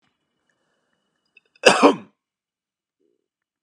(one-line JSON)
{"cough_length": "3.6 s", "cough_amplitude": 32768, "cough_signal_mean_std_ratio": 0.2, "survey_phase": "beta (2021-08-13 to 2022-03-07)", "age": "18-44", "gender": "Male", "wearing_mask": "No", "symptom_none": true, "smoker_status": "Never smoked", "respiratory_condition_asthma": false, "respiratory_condition_other": false, "recruitment_source": "REACT", "submission_delay": "3 days", "covid_test_result": "Negative", "covid_test_method": "RT-qPCR", "influenza_a_test_result": "Negative", "influenza_b_test_result": "Negative"}